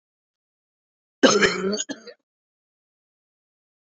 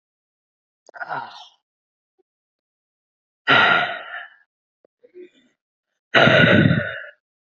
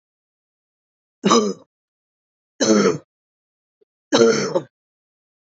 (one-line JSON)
{"cough_length": "3.8 s", "cough_amplitude": 25973, "cough_signal_mean_std_ratio": 0.28, "exhalation_length": "7.4 s", "exhalation_amplitude": 27812, "exhalation_signal_mean_std_ratio": 0.35, "three_cough_length": "5.5 s", "three_cough_amplitude": 32768, "three_cough_signal_mean_std_ratio": 0.35, "survey_phase": "beta (2021-08-13 to 2022-03-07)", "age": "45-64", "gender": "Female", "wearing_mask": "No", "symptom_cough_any": true, "symptom_runny_or_blocked_nose": true, "symptom_sore_throat": true, "symptom_fatigue": true, "symptom_headache": true, "smoker_status": "Never smoked", "respiratory_condition_asthma": false, "respiratory_condition_other": false, "recruitment_source": "Test and Trace", "submission_delay": "2 days", "covid_test_result": "Positive", "covid_test_method": "LFT"}